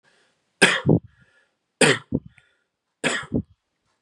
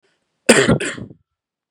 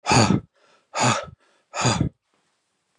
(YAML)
three_cough_length: 4.0 s
three_cough_amplitude: 31238
three_cough_signal_mean_std_ratio: 0.33
cough_length: 1.7 s
cough_amplitude: 32768
cough_signal_mean_std_ratio: 0.37
exhalation_length: 3.0 s
exhalation_amplitude: 20782
exhalation_signal_mean_std_ratio: 0.45
survey_phase: beta (2021-08-13 to 2022-03-07)
age: 18-44
gender: Male
wearing_mask: 'No'
symptom_cough_any: true
symptom_runny_or_blocked_nose: true
symptom_onset: 3 days
smoker_status: Never smoked
respiratory_condition_asthma: false
respiratory_condition_other: false
recruitment_source: Test and Trace
submission_delay: 1 day
covid_test_result: Positive
covid_test_method: ePCR